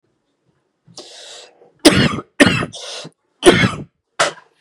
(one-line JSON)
{"three_cough_length": "4.6 s", "three_cough_amplitude": 32768, "three_cough_signal_mean_std_ratio": 0.36, "survey_phase": "beta (2021-08-13 to 2022-03-07)", "age": "18-44", "gender": "Male", "wearing_mask": "No", "symptom_cough_any": true, "symptom_new_continuous_cough": true, "symptom_sore_throat": true, "symptom_fatigue": true, "symptom_fever_high_temperature": true, "smoker_status": "Never smoked", "respiratory_condition_asthma": false, "respiratory_condition_other": false, "recruitment_source": "Test and Trace", "submission_delay": "-1 day", "covid_test_result": "Positive", "covid_test_method": "LFT"}